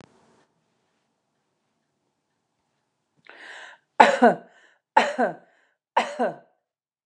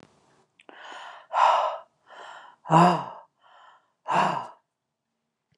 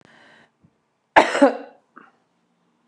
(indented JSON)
{
  "three_cough_length": "7.1 s",
  "three_cough_amplitude": 29204,
  "three_cough_signal_mean_std_ratio": 0.24,
  "exhalation_length": "5.6 s",
  "exhalation_amplitude": 21267,
  "exhalation_signal_mean_std_ratio": 0.37,
  "cough_length": "2.9 s",
  "cough_amplitude": 29204,
  "cough_signal_mean_std_ratio": 0.25,
  "survey_phase": "beta (2021-08-13 to 2022-03-07)",
  "age": "65+",
  "gender": "Female",
  "wearing_mask": "No",
  "symptom_none": true,
  "smoker_status": "Never smoked",
  "respiratory_condition_asthma": false,
  "respiratory_condition_other": false,
  "recruitment_source": "REACT",
  "submission_delay": "2 days",
  "covid_test_result": "Negative",
  "covid_test_method": "RT-qPCR",
  "influenza_a_test_result": "Negative",
  "influenza_b_test_result": "Negative"
}